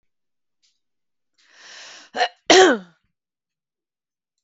{"cough_length": "4.4 s", "cough_amplitude": 32768, "cough_signal_mean_std_ratio": 0.24, "survey_phase": "beta (2021-08-13 to 2022-03-07)", "age": "45-64", "gender": "Female", "wearing_mask": "No", "symptom_none": true, "smoker_status": "Never smoked", "respiratory_condition_asthma": false, "respiratory_condition_other": false, "recruitment_source": "REACT", "submission_delay": "2 days", "covid_test_result": "Negative", "covid_test_method": "RT-qPCR"}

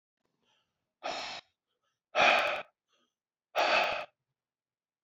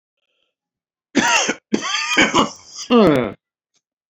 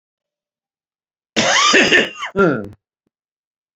{"exhalation_length": "5.0 s", "exhalation_amplitude": 9378, "exhalation_signal_mean_std_ratio": 0.37, "three_cough_length": "4.1 s", "three_cough_amplitude": 28814, "three_cough_signal_mean_std_ratio": 0.47, "cough_length": "3.8 s", "cough_amplitude": 28862, "cough_signal_mean_std_ratio": 0.43, "survey_phase": "beta (2021-08-13 to 2022-03-07)", "age": "45-64", "gender": "Male", "wearing_mask": "No", "symptom_cough_any": true, "symptom_shortness_of_breath": true, "symptom_abdominal_pain": true, "symptom_fatigue": true, "symptom_headache": true, "smoker_status": "Ex-smoker", "respiratory_condition_asthma": false, "respiratory_condition_other": false, "recruitment_source": "Test and Trace", "submission_delay": "2 days", "covid_test_result": "Positive", "covid_test_method": "RT-qPCR"}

